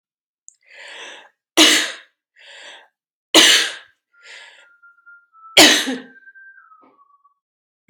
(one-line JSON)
{"three_cough_length": "7.9 s", "three_cough_amplitude": 32646, "three_cough_signal_mean_std_ratio": 0.3, "survey_phase": "beta (2021-08-13 to 2022-03-07)", "age": "45-64", "gender": "Female", "wearing_mask": "No", "symptom_runny_or_blocked_nose": true, "symptom_other": true, "symptom_onset": "3 days", "smoker_status": "Never smoked", "respiratory_condition_asthma": false, "respiratory_condition_other": false, "recruitment_source": "Test and Trace", "submission_delay": "2 days", "covid_test_result": "Positive", "covid_test_method": "RT-qPCR", "covid_ct_value": 17.0, "covid_ct_gene": "ORF1ab gene", "covid_ct_mean": 17.5, "covid_viral_load": "1800000 copies/ml", "covid_viral_load_category": "High viral load (>1M copies/ml)"}